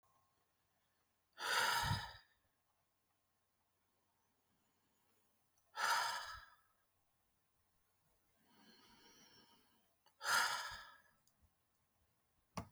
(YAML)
exhalation_length: 12.7 s
exhalation_amplitude: 2557
exhalation_signal_mean_std_ratio: 0.32
survey_phase: alpha (2021-03-01 to 2021-08-12)
age: 65+
gender: Female
wearing_mask: 'No'
symptom_none: true
symptom_onset: 12 days
smoker_status: Ex-smoker
respiratory_condition_asthma: false
respiratory_condition_other: false
recruitment_source: REACT
submission_delay: 1 day
covid_test_result: Negative
covid_test_method: RT-qPCR